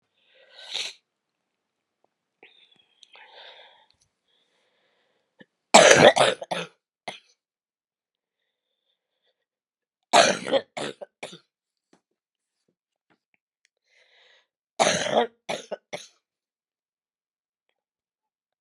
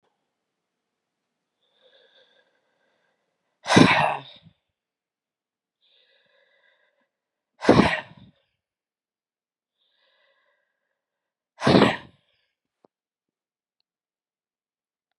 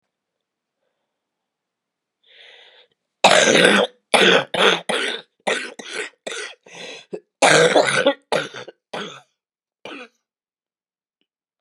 {"three_cough_length": "18.6 s", "three_cough_amplitude": 32767, "three_cough_signal_mean_std_ratio": 0.21, "exhalation_length": "15.2 s", "exhalation_amplitude": 31723, "exhalation_signal_mean_std_ratio": 0.2, "cough_length": "11.6 s", "cough_amplitude": 32768, "cough_signal_mean_std_ratio": 0.38, "survey_phase": "beta (2021-08-13 to 2022-03-07)", "age": "45-64", "gender": "Female", "wearing_mask": "No", "symptom_cough_any": true, "symptom_runny_or_blocked_nose": true, "symptom_sore_throat": true, "symptom_fatigue": true, "symptom_fever_high_temperature": true, "symptom_change_to_sense_of_smell_or_taste": true, "symptom_loss_of_taste": true, "smoker_status": "Ex-smoker", "respiratory_condition_asthma": false, "respiratory_condition_other": false, "recruitment_source": "Test and Trace", "submission_delay": "2 days", "covid_test_result": "Positive", "covid_test_method": "RT-qPCR", "covid_ct_value": 25.4, "covid_ct_gene": "ORF1ab gene"}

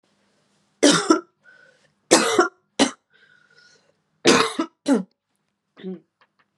{"three_cough_length": "6.6 s", "three_cough_amplitude": 32767, "three_cough_signal_mean_std_ratio": 0.34, "survey_phase": "beta (2021-08-13 to 2022-03-07)", "age": "18-44", "gender": "Female", "wearing_mask": "No", "symptom_cough_any": true, "symptom_new_continuous_cough": true, "symptom_fatigue": true, "symptom_headache": true, "symptom_onset": "3 days", "smoker_status": "Never smoked", "respiratory_condition_asthma": false, "respiratory_condition_other": false, "recruitment_source": "Test and Trace", "submission_delay": "1 day", "covid_test_result": "Positive", "covid_test_method": "RT-qPCR", "covid_ct_value": 22.5, "covid_ct_gene": "N gene"}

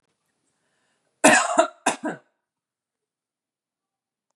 {"cough_length": "4.4 s", "cough_amplitude": 29402, "cough_signal_mean_std_ratio": 0.26, "survey_phase": "beta (2021-08-13 to 2022-03-07)", "age": "18-44", "gender": "Female", "wearing_mask": "No", "symptom_sore_throat": true, "symptom_abdominal_pain": true, "symptom_fatigue": true, "symptom_headache": true, "symptom_change_to_sense_of_smell_or_taste": true, "symptom_other": true, "symptom_onset": "3 days", "smoker_status": "Never smoked", "respiratory_condition_asthma": false, "respiratory_condition_other": false, "recruitment_source": "Test and Trace", "submission_delay": "2 days", "covid_test_result": "Negative", "covid_test_method": "RT-qPCR"}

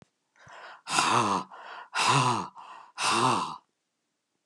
{"exhalation_length": "4.5 s", "exhalation_amplitude": 13720, "exhalation_signal_mean_std_ratio": 0.55, "survey_phase": "beta (2021-08-13 to 2022-03-07)", "age": "65+", "gender": "Male", "wearing_mask": "No", "symptom_none": true, "smoker_status": "Ex-smoker", "respiratory_condition_asthma": false, "respiratory_condition_other": true, "recruitment_source": "REACT", "submission_delay": "0 days", "covid_test_result": "Negative", "covid_test_method": "RT-qPCR", "influenza_a_test_result": "Negative", "influenza_b_test_result": "Negative"}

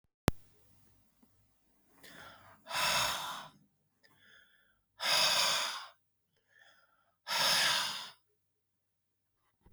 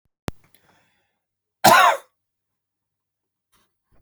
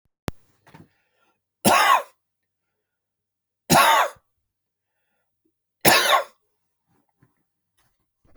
{"exhalation_length": "9.7 s", "exhalation_amplitude": 13507, "exhalation_signal_mean_std_ratio": 0.4, "cough_length": "4.0 s", "cough_amplitude": 29671, "cough_signal_mean_std_ratio": 0.23, "three_cough_length": "8.4 s", "three_cough_amplitude": 32768, "three_cough_signal_mean_std_ratio": 0.3, "survey_phase": "beta (2021-08-13 to 2022-03-07)", "age": "65+", "gender": "Male", "wearing_mask": "No", "symptom_change_to_sense_of_smell_or_taste": true, "smoker_status": "Never smoked", "respiratory_condition_asthma": false, "respiratory_condition_other": false, "recruitment_source": "Test and Trace", "submission_delay": "2 days", "covid_test_result": "Positive", "covid_test_method": "RT-qPCR"}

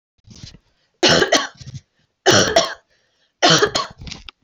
{"three_cough_length": "4.4 s", "three_cough_amplitude": 31143, "three_cough_signal_mean_std_ratio": 0.43, "survey_phase": "alpha (2021-03-01 to 2021-08-12)", "age": "18-44", "gender": "Female", "wearing_mask": "No", "symptom_shortness_of_breath": true, "symptom_headache": true, "smoker_status": "Ex-smoker", "respiratory_condition_asthma": false, "respiratory_condition_other": false, "recruitment_source": "REACT", "submission_delay": "1 day", "covid_test_result": "Negative", "covid_test_method": "RT-qPCR"}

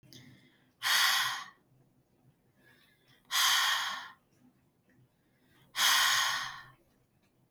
{"exhalation_length": "7.5 s", "exhalation_amplitude": 7231, "exhalation_signal_mean_std_ratio": 0.44, "survey_phase": "beta (2021-08-13 to 2022-03-07)", "age": "18-44", "gender": "Female", "wearing_mask": "No", "symptom_none": true, "symptom_onset": "12 days", "smoker_status": "Never smoked", "respiratory_condition_asthma": false, "respiratory_condition_other": false, "recruitment_source": "REACT", "submission_delay": "10 days", "covid_test_result": "Negative", "covid_test_method": "RT-qPCR", "influenza_a_test_result": "Negative", "influenza_b_test_result": "Negative"}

